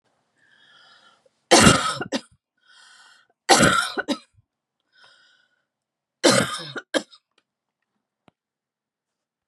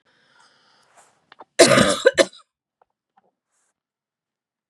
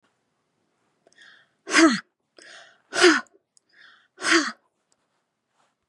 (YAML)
three_cough_length: 9.5 s
three_cough_amplitude: 32580
three_cough_signal_mean_std_ratio: 0.29
cough_length: 4.7 s
cough_amplitude: 32768
cough_signal_mean_std_ratio: 0.25
exhalation_length: 5.9 s
exhalation_amplitude: 25798
exhalation_signal_mean_std_ratio: 0.28
survey_phase: beta (2021-08-13 to 2022-03-07)
age: 45-64
gender: Female
wearing_mask: 'No'
symptom_none: true
smoker_status: Never smoked
respiratory_condition_asthma: false
respiratory_condition_other: false
recruitment_source: REACT
submission_delay: 1 day
covid_test_result: Negative
covid_test_method: RT-qPCR
influenza_a_test_result: Negative
influenza_b_test_result: Negative